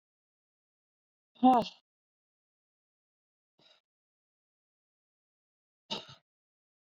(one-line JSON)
{"exhalation_length": "6.8 s", "exhalation_amplitude": 7254, "exhalation_signal_mean_std_ratio": 0.15, "survey_phase": "beta (2021-08-13 to 2022-03-07)", "age": "18-44", "gender": "Female", "wearing_mask": "No", "symptom_cough_any": true, "symptom_runny_or_blocked_nose": true, "symptom_fatigue": true, "symptom_fever_high_temperature": true, "symptom_headache": true, "symptom_change_to_sense_of_smell_or_taste": true, "symptom_loss_of_taste": true, "symptom_onset": "3 days", "smoker_status": "Ex-smoker", "respiratory_condition_asthma": false, "respiratory_condition_other": false, "recruitment_source": "Test and Trace", "submission_delay": "2 days", "covid_test_result": "Positive", "covid_test_method": "RT-qPCR"}